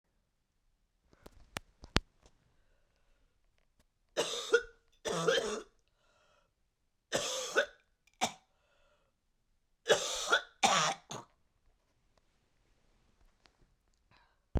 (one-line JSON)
{"three_cough_length": "14.6 s", "three_cough_amplitude": 25546, "three_cough_signal_mean_std_ratio": 0.3, "survey_phase": "beta (2021-08-13 to 2022-03-07)", "age": "65+", "gender": "Female", "wearing_mask": "No", "symptom_cough_any": true, "symptom_fever_high_temperature": true, "symptom_change_to_sense_of_smell_or_taste": true, "symptom_loss_of_taste": true, "smoker_status": "Ex-smoker", "respiratory_condition_asthma": false, "respiratory_condition_other": false, "recruitment_source": "Test and Trace", "submission_delay": "2 days", "covid_test_result": "Positive", "covid_test_method": "RT-qPCR"}